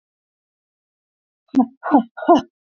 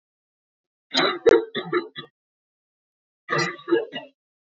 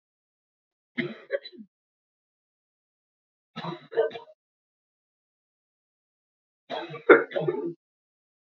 {"exhalation_length": "2.6 s", "exhalation_amplitude": 29436, "exhalation_signal_mean_std_ratio": 0.31, "cough_length": "4.5 s", "cough_amplitude": 21958, "cough_signal_mean_std_ratio": 0.36, "three_cough_length": "8.5 s", "three_cough_amplitude": 27522, "three_cough_signal_mean_std_ratio": 0.22, "survey_phase": "beta (2021-08-13 to 2022-03-07)", "age": "18-44", "gender": "Female", "wearing_mask": "No", "symptom_cough_any": true, "symptom_runny_or_blocked_nose": true, "symptom_shortness_of_breath": true, "symptom_sore_throat": true, "symptom_fatigue": true, "symptom_fever_high_temperature": true, "symptom_headache": true, "symptom_onset": "4 days", "smoker_status": "Prefer not to say", "respiratory_condition_asthma": false, "respiratory_condition_other": false, "recruitment_source": "Test and Trace", "submission_delay": "1 day", "covid_test_result": "Positive", "covid_test_method": "RT-qPCR", "covid_ct_value": 18.3, "covid_ct_gene": "ORF1ab gene", "covid_ct_mean": 18.9, "covid_viral_load": "640000 copies/ml", "covid_viral_load_category": "Low viral load (10K-1M copies/ml)"}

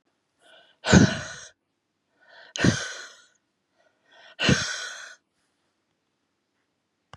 {"exhalation_length": "7.2 s", "exhalation_amplitude": 23696, "exhalation_signal_mean_std_ratio": 0.27, "survey_phase": "beta (2021-08-13 to 2022-03-07)", "age": "45-64", "gender": "Female", "wearing_mask": "No", "symptom_cough_any": true, "symptom_sore_throat": true, "symptom_onset": "3 days", "smoker_status": "Never smoked", "respiratory_condition_asthma": false, "respiratory_condition_other": false, "recruitment_source": "Test and Trace", "submission_delay": "2 days", "covid_test_result": "Positive", "covid_test_method": "RT-qPCR", "covid_ct_value": 20.1, "covid_ct_gene": "ORF1ab gene", "covid_ct_mean": 20.6, "covid_viral_load": "180000 copies/ml", "covid_viral_load_category": "Low viral load (10K-1M copies/ml)"}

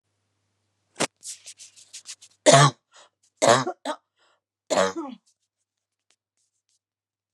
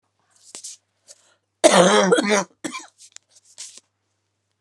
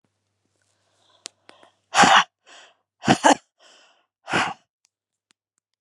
{"three_cough_length": "7.3 s", "three_cough_amplitude": 32240, "three_cough_signal_mean_std_ratio": 0.26, "cough_length": "4.6 s", "cough_amplitude": 32689, "cough_signal_mean_std_ratio": 0.34, "exhalation_length": "5.8 s", "exhalation_amplitude": 32738, "exhalation_signal_mean_std_ratio": 0.26, "survey_phase": "beta (2021-08-13 to 2022-03-07)", "age": "45-64", "gender": "Female", "wearing_mask": "No", "symptom_cough_any": true, "symptom_runny_or_blocked_nose": true, "symptom_sore_throat": true, "symptom_fatigue": true, "symptom_headache": true, "symptom_other": true, "symptom_onset": "3 days", "smoker_status": "Ex-smoker", "respiratory_condition_asthma": false, "respiratory_condition_other": false, "recruitment_source": "Test and Trace", "submission_delay": "1 day", "covid_test_result": "Positive", "covid_test_method": "RT-qPCR", "covid_ct_value": 21.2, "covid_ct_gene": "ORF1ab gene", "covid_ct_mean": 22.5, "covid_viral_load": "41000 copies/ml", "covid_viral_load_category": "Low viral load (10K-1M copies/ml)"}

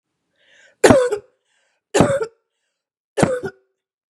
{"three_cough_length": "4.1 s", "three_cough_amplitude": 32768, "three_cough_signal_mean_std_ratio": 0.34, "survey_phase": "beta (2021-08-13 to 2022-03-07)", "age": "45-64", "gender": "Female", "wearing_mask": "No", "symptom_cough_any": true, "symptom_onset": "12 days", "smoker_status": "Current smoker (e-cigarettes or vapes only)", "respiratory_condition_asthma": true, "respiratory_condition_other": false, "recruitment_source": "REACT", "submission_delay": "7 days", "covid_test_result": "Negative", "covid_test_method": "RT-qPCR", "influenza_a_test_result": "Negative", "influenza_b_test_result": "Negative"}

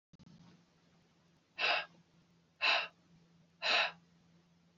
{"exhalation_length": "4.8 s", "exhalation_amplitude": 3965, "exhalation_signal_mean_std_ratio": 0.35, "survey_phase": "alpha (2021-03-01 to 2021-08-12)", "age": "45-64", "gender": "Male", "wearing_mask": "No", "symptom_none": true, "smoker_status": "Never smoked", "respiratory_condition_asthma": false, "respiratory_condition_other": false, "recruitment_source": "REACT", "submission_delay": "1 day", "covid_test_result": "Negative", "covid_test_method": "RT-qPCR"}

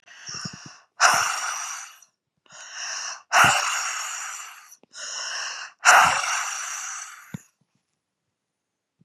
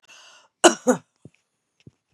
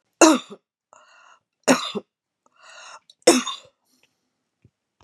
{"exhalation_length": "9.0 s", "exhalation_amplitude": 30840, "exhalation_signal_mean_std_ratio": 0.45, "cough_length": "2.1 s", "cough_amplitude": 32754, "cough_signal_mean_std_ratio": 0.21, "three_cough_length": "5.0 s", "three_cough_amplitude": 31639, "three_cough_signal_mean_std_ratio": 0.25, "survey_phase": "beta (2021-08-13 to 2022-03-07)", "age": "45-64", "gender": "Female", "wearing_mask": "No", "symptom_other": true, "smoker_status": "Ex-smoker", "respiratory_condition_asthma": false, "respiratory_condition_other": false, "recruitment_source": "REACT", "submission_delay": "17 days", "covid_test_result": "Negative", "covid_test_method": "RT-qPCR", "influenza_a_test_result": "Negative", "influenza_b_test_result": "Negative"}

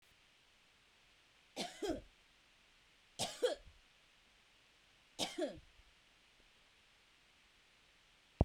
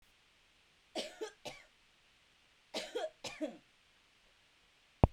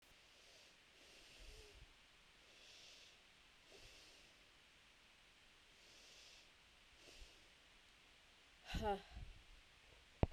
{"three_cough_length": "8.4 s", "three_cough_amplitude": 6707, "three_cough_signal_mean_std_ratio": 0.28, "cough_length": "5.1 s", "cough_amplitude": 16385, "cough_signal_mean_std_ratio": 0.22, "exhalation_length": "10.3 s", "exhalation_amplitude": 4617, "exhalation_signal_mean_std_ratio": 0.34, "survey_phase": "beta (2021-08-13 to 2022-03-07)", "age": "18-44", "gender": "Female", "wearing_mask": "No", "symptom_none": true, "smoker_status": "Never smoked", "respiratory_condition_asthma": false, "respiratory_condition_other": false, "recruitment_source": "REACT", "submission_delay": "2 days", "covid_test_result": "Negative", "covid_test_method": "RT-qPCR"}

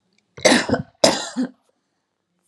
{"cough_length": "2.5 s", "cough_amplitude": 32768, "cough_signal_mean_std_ratio": 0.38, "survey_phase": "alpha (2021-03-01 to 2021-08-12)", "age": "18-44", "gender": "Female", "wearing_mask": "No", "symptom_none": true, "smoker_status": "Ex-smoker", "respiratory_condition_asthma": false, "respiratory_condition_other": false, "recruitment_source": "REACT", "submission_delay": "1 day", "covid_test_result": "Negative", "covid_test_method": "RT-qPCR"}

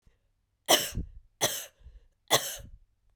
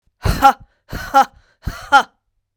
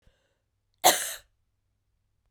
{"three_cough_length": "3.2 s", "three_cough_amplitude": 14252, "three_cough_signal_mean_std_ratio": 0.34, "exhalation_length": "2.6 s", "exhalation_amplitude": 32768, "exhalation_signal_mean_std_ratio": 0.37, "cough_length": "2.3 s", "cough_amplitude": 24163, "cough_signal_mean_std_ratio": 0.22, "survey_phase": "beta (2021-08-13 to 2022-03-07)", "age": "45-64", "gender": "Female", "wearing_mask": "No", "symptom_cough_any": true, "symptom_runny_or_blocked_nose": true, "symptom_shortness_of_breath": true, "symptom_fatigue": true, "symptom_headache": true, "symptom_change_to_sense_of_smell_or_taste": true, "symptom_onset": "4 days", "smoker_status": "Ex-smoker", "respiratory_condition_asthma": false, "respiratory_condition_other": false, "recruitment_source": "Test and Trace", "submission_delay": "1 day", "covid_test_result": "Positive", "covid_test_method": "RT-qPCR", "covid_ct_value": 18.5, "covid_ct_gene": "ORF1ab gene", "covid_ct_mean": 18.8, "covid_viral_load": "670000 copies/ml", "covid_viral_load_category": "Low viral load (10K-1M copies/ml)"}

